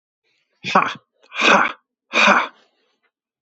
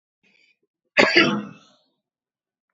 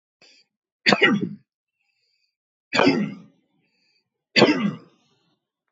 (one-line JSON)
{"exhalation_length": "3.4 s", "exhalation_amplitude": 27675, "exhalation_signal_mean_std_ratio": 0.4, "cough_length": "2.7 s", "cough_amplitude": 28521, "cough_signal_mean_std_ratio": 0.3, "three_cough_length": "5.7 s", "three_cough_amplitude": 27410, "three_cough_signal_mean_std_ratio": 0.34, "survey_phase": "beta (2021-08-13 to 2022-03-07)", "age": "45-64", "gender": "Male", "wearing_mask": "No", "symptom_runny_or_blocked_nose": true, "smoker_status": "Ex-smoker", "respiratory_condition_asthma": false, "respiratory_condition_other": false, "recruitment_source": "REACT", "submission_delay": "1 day", "covid_test_result": "Negative", "covid_test_method": "RT-qPCR", "influenza_a_test_result": "Negative", "influenza_b_test_result": "Negative"}